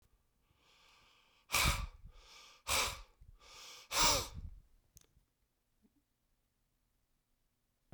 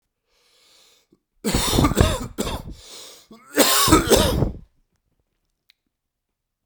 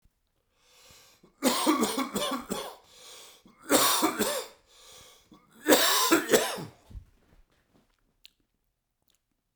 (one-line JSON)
{"exhalation_length": "7.9 s", "exhalation_amplitude": 5026, "exhalation_signal_mean_std_ratio": 0.32, "cough_length": "6.7 s", "cough_amplitude": 32768, "cough_signal_mean_std_ratio": 0.42, "three_cough_length": "9.6 s", "three_cough_amplitude": 21876, "three_cough_signal_mean_std_ratio": 0.42, "survey_phase": "beta (2021-08-13 to 2022-03-07)", "age": "18-44", "gender": "Male", "wearing_mask": "No", "symptom_cough_any": true, "symptom_runny_or_blocked_nose": true, "symptom_sore_throat": true, "symptom_onset": "3 days", "smoker_status": "Current smoker (e-cigarettes or vapes only)", "respiratory_condition_asthma": false, "respiratory_condition_other": false, "recruitment_source": "Test and Trace", "submission_delay": "2 days", "covid_test_result": "Positive", "covid_test_method": "RT-qPCR", "covid_ct_value": 21.8, "covid_ct_gene": "ORF1ab gene", "covid_ct_mean": 23.4, "covid_viral_load": "21000 copies/ml", "covid_viral_load_category": "Low viral load (10K-1M copies/ml)"}